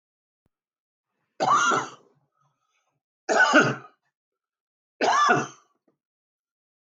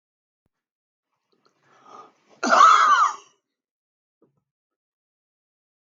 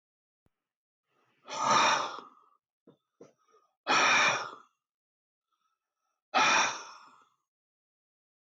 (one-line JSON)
{"three_cough_length": "6.8 s", "three_cough_amplitude": 20040, "three_cough_signal_mean_std_ratio": 0.37, "cough_length": "6.0 s", "cough_amplitude": 18959, "cough_signal_mean_std_ratio": 0.28, "exhalation_length": "8.5 s", "exhalation_amplitude": 8035, "exhalation_signal_mean_std_ratio": 0.36, "survey_phase": "alpha (2021-03-01 to 2021-08-12)", "age": "65+", "gender": "Male", "wearing_mask": "No", "symptom_none": true, "smoker_status": "Ex-smoker", "respiratory_condition_asthma": false, "respiratory_condition_other": false, "recruitment_source": "REACT", "submission_delay": "3 days", "covid_test_result": "Negative", "covid_test_method": "RT-qPCR"}